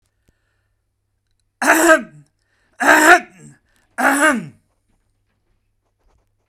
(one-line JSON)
{"three_cough_length": "6.5 s", "three_cough_amplitude": 32768, "three_cough_signal_mean_std_ratio": 0.34, "survey_phase": "beta (2021-08-13 to 2022-03-07)", "age": "45-64", "gender": "Male", "wearing_mask": "No", "symptom_none": true, "smoker_status": "Never smoked", "respiratory_condition_asthma": false, "respiratory_condition_other": false, "recruitment_source": "REACT", "submission_delay": "2 days", "covid_test_result": "Negative", "covid_test_method": "RT-qPCR"}